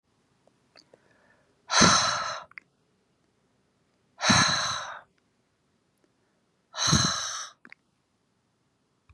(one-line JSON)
{"exhalation_length": "9.1 s", "exhalation_amplitude": 18577, "exhalation_signal_mean_std_ratio": 0.34, "survey_phase": "beta (2021-08-13 to 2022-03-07)", "age": "65+", "gender": "Female", "wearing_mask": "No", "symptom_none": true, "smoker_status": "Never smoked", "respiratory_condition_asthma": false, "respiratory_condition_other": false, "recruitment_source": "REACT", "submission_delay": "2 days", "covid_test_result": "Negative", "covid_test_method": "RT-qPCR", "influenza_a_test_result": "Negative", "influenza_b_test_result": "Negative"}